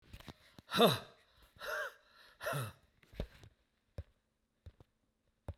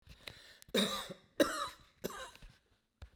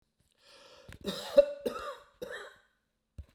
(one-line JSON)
{"exhalation_length": "5.6 s", "exhalation_amplitude": 6108, "exhalation_signal_mean_std_ratio": 0.3, "cough_length": "3.2 s", "cough_amplitude": 6660, "cough_signal_mean_std_ratio": 0.38, "three_cough_length": "3.3 s", "three_cough_amplitude": 11218, "three_cough_signal_mean_std_ratio": 0.27, "survey_phase": "beta (2021-08-13 to 2022-03-07)", "age": "65+", "gender": "Male", "wearing_mask": "No", "symptom_none": true, "symptom_onset": "13 days", "smoker_status": "Never smoked", "respiratory_condition_asthma": false, "respiratory_condition_other": false, "recruitment_source": "REACT", "submission_delay": "5 days", "covid_test_result": "Negative", "covid_test_method": "RT-qPCR", "influenza_a_test_result": "Negative", "influenza_b_test_result": "Negative"}